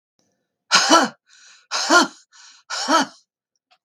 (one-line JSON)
{"exhalation_length": "3.8 s", "exhalation_amplitude": 32768, "exhalation_signal_mean_std_ratio": 0.39, "survey_phase": "beta (2021-08-13 to 2022-03-07)", "age": "65+", "gender": "Female", "wearing_mask": "No", "symptom_none": true, "smoker_status": "Never smoked", "respiratory_condition_asthma": false, "respiratory_condition_other": false, "recruitment_source": "REACT", "submission_delay": "7 days", "covid_test_result": "Negative", "covid_test_method": "RT-qPCR", "influenza_a_test_result": "Negative", "influenza_b_test_result": "Negative"}